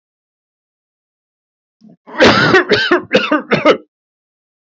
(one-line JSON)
{"cough_length": "4.7 s", "cough_amplitude": 32766, "cough_signal_mean_std_ratio": 0.43, "survey_phase": "beta (2021-08-13 to 2022-03-07)", "age": "45-64", "gender": "Male", "wearing_mask": "No", "symptom_none": true, "smoker_status": "Ex-smoker", "respiratory_condition_asthma": false, "respiratory_condition_other": false, "recruitment_source": "REACT", "submission_delay": "6 days", "covid_test_result": "Negative", "covid_test_method": "RT-qPCR"}